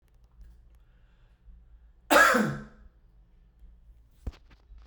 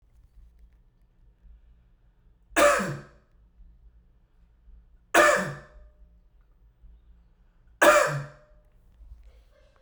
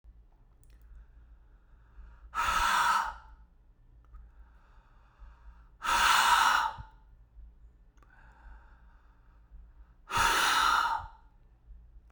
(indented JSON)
{
  "cough_length": "4.9 s",
  "cough_amplitude": 16087,
  "cough_signal_mean_std_ratio": 0.28,
  "three_cough_length": "9.8 s",
  "three_cough_amplitude": 19337,
  "three_cough_signal_mean_std_ratio": 0.29,
  "exhalation_length": "12.1 s",
  "exhalation_amplitude": 9020,
  "exhalation_signal_mean_std_ratio": 0.44,
  "survey_phase": "beta (2021-08-13 to 2022-03-07)",
  "age": "45-64",
  "gender": "Male",
  "wearing_mask": "No",
  "symptom_sore_throat": true,
  "smoker_status": "Never smoked",
  "respiratory_condition_asthma": false,
  "respiratory_condition_other": false,
  "recruitment_source": "REACT",
  "submission_delay": "3 days",
  "covid_test_result": "Negative",
  "covid_test_method": "RT-qPCR"
}